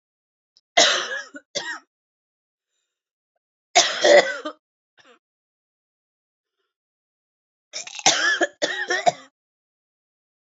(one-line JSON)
{"three_cough_length": "10.4 s", "three_cough_amplitude": 31707, "three_cough_signal_mean_std_ratio": 0.31, "survey_phase": "beta (2021-08-13 to 2022-03-07)", "age": "18-44", "gender": "Female", "wearing_mask": "No", "symptom_cough_any": true, "symptom_sore_throat": true, "symptom_diarrhoea": true, "symptom_fatigue": true, "symptom_fever_high_temperature": true, "symptom_onset": "2 days", "smoker_status": "Ex-smoker", "respiratory_condition_asthma": false, "respiratory_condition_other": false, "recruitment_source": "Test and Trace", "submission_delay": "1 day", "covid_test_result": "Negative", "covid_test_method": "RT-qPCR"}